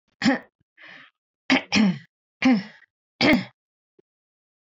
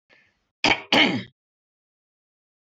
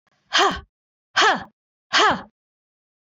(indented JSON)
{
  "three_cough_length": "4.7 s",
  "three_cough_amplitude": 19361,
  "three_cough_signal_mean_std_ratio": 0.38,
  "cough_length": "2.7 s",
  "cough_amplitude": 21041,
  "cough_signal_mean_std_ratio": 0.3,
  "exhalation_length": "3.2 s",
  "exhalation_amplitude": 21495,
  "exhalation_signal_mean_std_ratio": 0.39,
  "survey_phase": "beta (2021-08-13 to 2022-03-07)",
  "age": "45-64",
  "gender": "Female",
  "wearing_mask": "No",
  "symptom_none": true,
  "smoker_status": "Never smoked",
  "respiratory_condition_asthma": false,
  "respiratory_condition_other": false,
  "recruitment_source": "REACT",
  "submission_delay": "2 days",
  "covid_test_result": "Negative",
  "covid_test_method": "RT-qPCR"
}